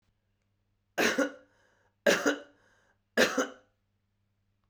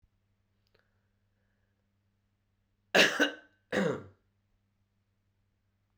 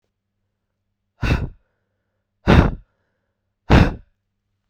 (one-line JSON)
{"three_cough_length": "4.7 s", "three_cough_amplitude": 12680, "three_cough_signal_mean_std_ratio": 0.33, "cough_length": "6.0 s", "cough_amplitude": 12250, "cough_signal_mean_std_ratio": 0.23, "exhalation_length": "4.7 s", "exhalation_amplitude": 32768, "exhalation_signal_mean_std_ratio": 0.29, "survey_phase": "beta (2021-08-13 to 2022-03-07)", "age": "18-44", "gender": "Male", "wearing_mask": "No", "symptom_sore_throat": true, "symptom_fatigue": true, "symptom_fever_high_temperature": true, "symptom_headache": true, "smoker_status": "Never smoked", "respiratory_condition_asthma": false, "respiratory_condition_other": false, "recruitment_source": "Test and Trace", "submission_delay": "2 days", "covid_test_result": "Positive", "covid_test_method": "RT-qPCR", "covid_ct_value": 28.4, "covid_ct_gene": "N gene"}